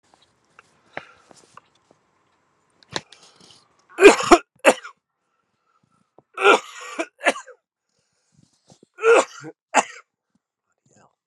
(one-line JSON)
{"three_cough_length": "11.3 s", "three_cough_amplitude": 32768, "three_cough_signal_mean_std_ratio": 0.23, "survey_phase": "beta (2021-08-13 to 2022-03-07)", "age": "65+", "gender": "Male", "wearing_mask": "No", "symptom_none": true, "smoker_status": "Current smoker (1 to 10 cigarettes per day)", "respiratory_condition_asthma": false, "respiratory_condition_other": false, "recruitment_source": "REACT", "submission_delay": "2 days", "covid_test_result": "Negative", "covid_test_method": "RT-qPCR"}